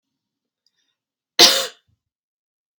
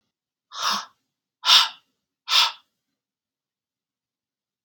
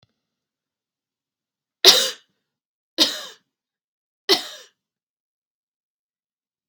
cough_length: 2.8 s
cough_amplitude: 32768
cough_signal_mean_std_ratio: 0.21
exhalation_length: 4.6 s
exhalation_amplitude: 27857
exhalation_signal_mean_std_ratio: 0.28
three_cough_length: 6.7 s
three_cough_amplitude: 32768
three_cough_signal_mean_std_ratio: 0.2
survey_phase: beta (2021-08-13 to 2022-03-07)
age: 18-44
gender: Female
wearing_mask: 'No'
symptom_none: true
smoker_status: Ex-smoker
respiratory_condition_asthma: false
respiratory_condition_other: false
recruitment_source: REACT
submission_delay: 0 days
covid_test_result: Negative
covid_test_method: RT-qPCR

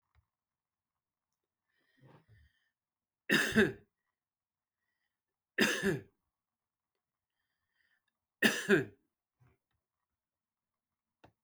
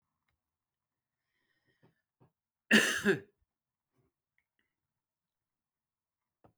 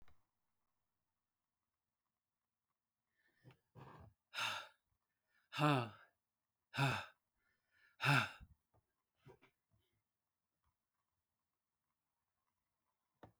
three_cough_length: 11.4 s
three_cough_amplitude: 7972
three_cough_signal_mean_std_ratio: 0.24
cough_length: 6.6 s
cough_amplitude: 9748
cough_signal_mean_std_ratio: 0.19
exhalation_length: 13.4 s
exhalation_amplitude: 3551
exhalation_signal_mean_std_ratio: 0.23
survey_phase: beta (2021-08-13 to 2022-03-07)
age: 65+
gender: Male
wearing_mask: 'No'
symptom_none: true
smoker_status: Never smoked
respiratory_condition_asthma: false
respiratory_condition_other: false
recruitment_source: REACT
submission_delay: 1 day
covid_test_result: Negative
covid_test_method: RT-qPCR
influenza_a_test_result: Negative
influenza_b_test_result: Negative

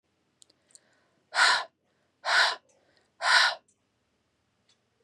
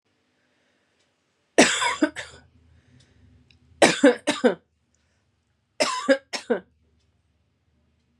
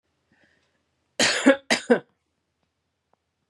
exhalation_length: 5.0 s
exhalation_amplitude: 13583
exhalation_signal_mean_std_ratio: 0.34
three_cough_length: 8.2 s
three_cough_amplitude: 29756
three_cough_signal_mean_std_ratio: 0.29
cough_length: 3.5 s
cough_amplitude: 23337
cough_signal_mean_std_ratio: 0.28
survey_phase: beta (2021-08-13 to 2022-03-07)
age: 18-44
gender: Female
wearing_mask: 'No'
symptom_none: true
smoker_status: Never smoked
respiratory_condition_asthma: false
respiratory_condition_other: false
recruitment_source: REACT
submission_delay: 3 days
covid_test_result: Negative
covid_test_method: RT-qPCR
influenza_a_test_result: Negative
influenza_b_test_result: Negative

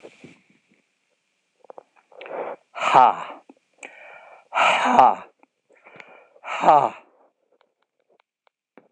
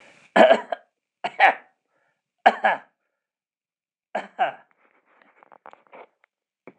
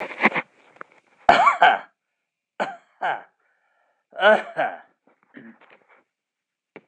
exhalation_length: 8.9 s
exhalation_amplitude: 26028
exhalation_signal_mean_std_ratio: 0.3
cough_length: 6.8 s
cough_amplitude: 25984
cough_signal_mean_std_ratio: 0.25
three_cough_length: 6.9 s
three_cough_amplitude: 26028
three_cough_signal_mean_std_ratio: 0.32
survey_phase: beta (2021-08-13 to 2022-03-07)
age: 65+
gender: Male
wearing_mask: 'No'
symptom_none: true
smoker_status: Never smoked
respiratory_condition_asthma: false
respiratory_condition_other: false
recruitment_source: Test and Trace
submission_delay: 0 days
covid_test_result: Negative
covid_test_method: RT-qPCR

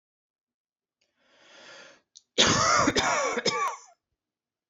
three_cough_length: 4.7 s
three_cough_amplitude: 17371
three_cough_signal_mean_std_ratio: 0.44
survey_phase: beta (2021-08-13 to 2022-03-07)
age: 18-44
gender: Male
wearing_mask: 'No'
symptom_none: true
smoker_status: Never smoked
respiratory_condition_asthma: false
respiratory_condition_other: false
recruitment_source: REACT
submission_delay: 3 days
covid_test_result: Negative
covid_test_method: RT-qPCR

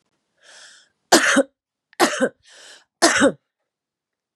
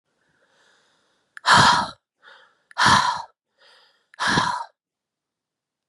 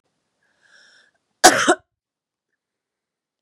three_cough_length: 4.4 s
three_cough_amplitude: 32632
three_cough_signal_mean_std_ratio: 0.35
exhalation_length: 5.9 s
exhalation_amplitude: 29031
exhalation_signal_mean_std_ratio: 0.36
cough_length: 3.4 s
cough_amplitude: 32768
cough_signal_mean_std_ratio: 0.2
survey_phase: beta (2021-08-13 to 2022-03-07)
age: 18-44
gender: Female
wearing_mask: 'No'
symptom_cough_any: true
symptom_runny_or_blocked_nose: true
symptom_shortness_of_breath: true
symptom_sore_throat: true
symptom_fatigue: true
symptom_headache: true
symptom_change_to_sense_of_smell_or_taste: true
symptom_onset: 6 days
smoker_status: Current smoker (1 to 10 cigarettes per day)
respiratory_condition_asthma: true
respiratory_condition_other: false
recruitment_source: Test and Trace
submission_delay: 1 day
covid_test_result: Positive
covid_test_method: RT-qPCR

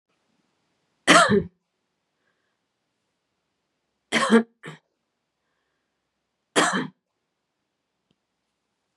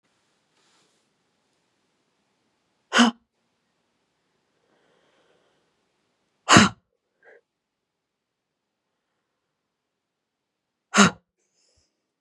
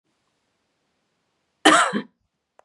three_cough_length: 9.0 s
three_cough_amplitude: 32260
three_cough_signal_mean_std_ratio: 0.24
exhalation_length: 12.2 s
exhalation_amplitude: 32768
exhalation_signal_mean_std_ratio: 0.16
cough_length: 2.6 s
cough_amplitude: 32445
cough_signal_mean_std_ratio: 0.26
survey_phase: beta (2021-08-13 to 2022-03-07)
age: 18-44
gender: Female
wearing_mask: 'No'
symptom_none: true
smoker_status: Never smoked
respiratory_condition_asthma: true
respiratory_condition_other: false
recruitment_source: REACT
submission_delay: 6 days
covid_test_result: Negative
covid_test_method: RT-qPCR
influenza_a_test_result: Negative
influenza_b_test_result: Negative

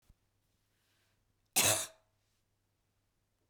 cough_length: 3.5 s
cough_amplitude: 5445
cough_signal_mean_std_ratio: 0.23
survey_phase: beta (2021-08-13 to 2022-03-07)
age: 45-64
gender: Female
wearing_mask: 'No'
symptom_runny_or_blocked_nose: true
smoker_status: Ex-smoker
respiratory_condition_asthma: false
respiratory_condition_other: false
recruitment_source: REACT
submission_delay: 2 days
covid_test_result: Negative
covid_test_method: RT-qPCR
influenza_a_test_result: Negative
influenza_b_test_result: Negative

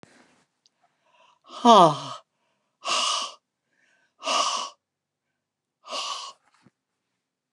exhalation_length: 7.5 s
exhalation_amplitude: 26980
exhalation_signal_mean_std_ratio: 0.28
survey_phase: beta (2021-08-13 to 2022-03-07)
age: 45-64
gender: Female
wearing_mask: 'No'
symptom_none: true
smoker_status: Ex-smoker
respiratory_condition_asthma: false
respiratory_condition_other: false
recruitment_source: REACT
submission_delay: 2 days
covid_test_result: Negative
covid_test_method: RT-qPCR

